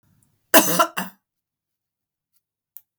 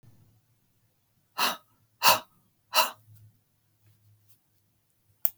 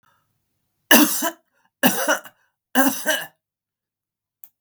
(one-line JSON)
{"cough_length": "3.0 s", "cough_amplitude": 32768, "cough_signal_mean_std_ratio": 0.25, "exhalation_length": "5.4 s", "exhalation_amplitude": 32188, "exhalation_signal_mean_std_ratio": 0.23, "three_cough_length": "4.6 s", "three_cough_amplitude": 32768, "three_cough_signal_mean_std_ratio": 0.36, "survey_phase": "beta (2021-08-13 to 2022-03-07)", "age": "65+", "gender": "Female", "wearing_mask": "No", "symptom_none": true, "smoker_status": "Ex-smoker", "respiratory_condition_asthma": false, "respiratory_condition_other": false, "recruitment_source": "REACT", "submission_delay": "2 days", "covid_test_result": "Negative", "covid_test_method": "RT-qPCR", "influenza_a_test_result": "Unknown/Void", "influenza_b_test_result": "Unknown/Void"}